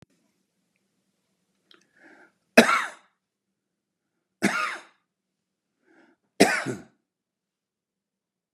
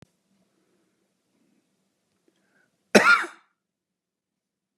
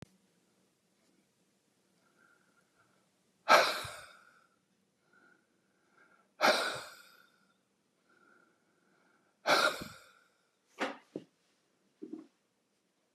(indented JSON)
{
  "three_cough_length": "8.5 s",
  "three_cough_amplitude": 32348,
  "three_cough_signal_mean_std_ratio": 0.21,
  "cough_length": "4.8 s",
  "cough_amplitude": 30379,
  "cough_signal_mean_std_ratio": 0.19,
  "exhalation_length": "13.1 s",
  "exhalation_amplitude": 10997,
  "exhalation_signal_mean_std_ratio": 0.23,
  "survey_phase": "beta (2021-08-13 to 2022-03-07)",
  "age": "65+",
  "gender": "Male",
  "wearing_mask": "No",
  "symptom_none": true,
  "smoker_status": "Ex-smoker",
  "respiratory_condition_asthma": false,
  "respiratory_condition_other": false,
  "recruitment_source": "REACT",
  "submission_delay": "2 days",
  "covid_test_result": "Negative",
  "covid_test_method": "RT-qPCR",
  "influenza_a_test_result": "Negative",
  "influenza_b_test_result": "Negative"
}